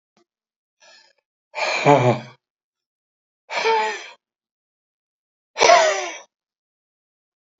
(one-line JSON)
{"exhalation_length": "7.6 s", "exhalation_amplitude": 27652, "exhalation_signal_mean_std_ratio": 0.33, "survey_phase": "alpha (2021-03-01 to 2021-08-12)", "age": "65+", "gender": "Male", "wearing_mask": "No", "symptom_none": true, "smoker_status": "Never smoked", "respiratory_condition_asthma": false, "respiratory_condition_other": false, "recruitment_source": "REACT", "submission_delay": "1 day", "covid_test_result": "Negative", "covid_test_method": "RT-qPCR"}